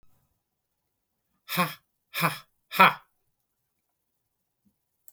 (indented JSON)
{
  "exhalation_length": "5.1 s",
  "exhalation_amplitude": 26957,
  "exhalation_signal_mean_std_ratio": 0.21,
  "survey_phase": "beta (2021-08-13 to 2022-03-07)",
  "age": "45-64",
  "gender": "Male",
  "wearing_mask": "No",
  "symptom_none": true,
  "smoker_status": "Never smoked",
  "respiratory_condition_asthma": false,
  "respiratory_condition_other": false,
  "recruitment_source": "REACT",
  "submission_delay": "3 days",
  "covid_test_result": "Negative",
  "covid_test_method": "RT-qPCR"
}